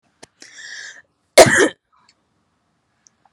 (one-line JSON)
{"cough_length": "3.3 s", "cough_amplitude": 32768, "cough_signal_mean_std_ratio": 0.24, "survey_phase": "beta (2021-08-13 to 2022-03-07)", "age": "18-44", "gender": "Female", "wearing_mask": "No", "symptom_none": true, "symptom_onset": "8 days", "smoker_status": "Ex-smoker", "respiratory_condition_asthma": false, "respiratory_condition_other": false, "recruitment_source": "REACT", "submission_delay": "3 days", "covid_test_result": "Negative", "covid_test_method": "RT-qPCR"}